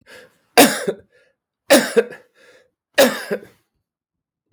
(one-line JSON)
{"three_cough_length": "4.5 s", "three_cough_amplitude": 32768, "three_cough_signal_mean_std_ratio": 0.32, "survey_phase": "beta (2021-08-13 to 2022-03-07)", "age": "65+", "gender": "Male", "wearing_mask": "No", "symptom_cough_any": true, "symptom_onset": "5 days", "smoker_status": "Never smoked", "respiratory_condition_asthma": false, "respiratory_condition_other": false, "recruitment_source": "REACT", "submission_delay": "1 day", "covid_test_result": "Positive", "covid_test_method": "RT-qPCR", "covid_ct_value": 20.8, "covid_ct_gene": "E gene", "influenza_a_test_result": "Negative", "influenza_b_test_result": "Negative"}